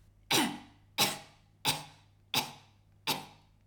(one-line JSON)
{"cough_length": "3.7 s", "cough_amplitude": 6948, "cough_signal_mean_std_ratio": 0.4, "survey_phase": "alpha (2021-03-01 to 2021-08-12)", "age": "45-64", "gender": "Female", "wearing_mask": "No", "symptom_none": true, "smoker_status": "Never smoked", "respiratory_condition_asthma": false, "respiratory_condition_other": false, "recruitment_source": "REACT", "submission_delay": "1 day", "covid_test_result": "Negative", "covid_test_method": "RT-qPCR"}